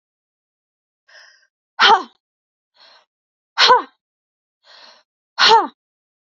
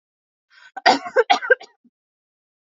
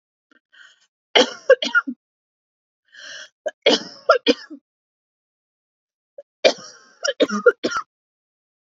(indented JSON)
{
  "exhalation_length": "6.4 s",
  "exhalation_amplitude": 32357,
  "exhalation_signal_mean_std_ratio": 0.27,
  "cough_length": "2.6 s",
  "cough_amplitude": 28406,
  "cough_signal_mean_std_ratio": 0.29,
  "three_cough_length": "8.6 s",
  "three_cough_amplitude": 32767,
  "three_cough_signal_mean_std_ratio": 0.28,
  "survey_phase": "beta (2021-08-13 to 2022-03-07)",
  "age": "18-44",
  "gender": "Female",
  "wearing_mask": "No",
  "symptom_none": true,
  "smoker_status": "Ex-smoker",
  "respiratory_condition_asthma": false,
  "respiratory_condition_other": false,
  "recruitment_source": "REACT",
  "submission_delay": "1 day",
  "covid_test_result": "Negative",
  "covid_test_method": "RT-qPCR"
}